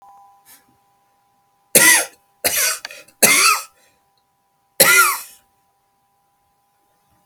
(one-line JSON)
{"three_cough_length": "7.3 s", "three_cough_amplitude": 32768, "three_cough_signal_mean_std_ratio": 0.35, "survey_phase": "alpha (2021-03-01 to 2021-08-12)", "age": "65+", "gender": "Male", "wearing_mask": "No", "symptom_fatigue": true, "symptom_fever_high_temperature": true, "symptom_change_to_sense_of_smell_or_taste": true, "symptom_onset": "3 days", "smoker_status": "Never smoked", "respiratory_condition_asthma": false, "respiratory_condition_other": false, "recruitment_source": "Test and Trace", "submission_delay": "1 day", "covid_test_result": "Positive", "covid_test_method": "RT-qPCR", "covid_ct_value": 16.0, "covid_ct_gene": "N gene", "covid_ct_mean": 17.7, "covid_viral_load": "1600000 copies/ml", "covid_viral_load_category": "High viral load (>1M copies/ml)"}